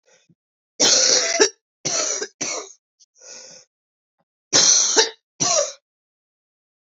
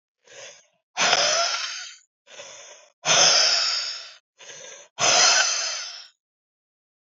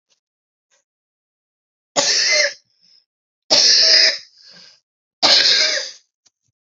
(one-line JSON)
{"cough_length": "7.0 s", "cough_amplitude": 30721, "cough_signal_mean_std_ratio": 0.43, "exhalation_length": "7.2 s", "exhalation_amplitude": 26235, "exhalation_signal_mean_std_ratio": 0.51, "three_cough_length": "6.7 s", "three_cough_amplitude": 32768, "three_cough_signal_mean_std_ratio": 0.43, "survey_phase": "beta (2021-08-13 to 2022-03-07)", "age": "18-44", "gender": "Female", "wearing_mask": "No", "symptom_cough_any": true, "symptom_runny_or_blocked_nose": true, "symptom_fatigue": true, "symptom_headache": true, "symptom_change_to_sense_of_smell_or_taste": true, "symptom_onset": "2 days", "smoker_status": "Current smoker (1 to 10 cigarettes per day)", "respiratory_condition_asthma": false, "respiratory_condition_other": false, "recruitment_source": "Test and Trace", "submission_delay": "1 day", "covid_test_result": "Positive", "covid_test_method": "ePCR"}